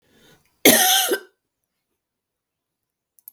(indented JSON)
{
  "cough_length": "3.3 s",
  "cough_amplitude": 32768,
  "cough_signal_mean_std_ratio": 0.3,
  "survey_phase": "beta (2021-08-13 to 2022-03-07)",
  "age": "65+",
  "gender": "Female",
  "wearing_mask": "No",
  "symptom_none": true,
  "smoker_status": "Ex-smoker",
  "respiratory_condition_asthma": false,
  "respiratory_condition_other": true,
  "recruitment_source": "Test and Trace",
  "submission_delay": "-1 day",
  "covid_test_result": "Positive",
  "covid_test_method": "LFT"
}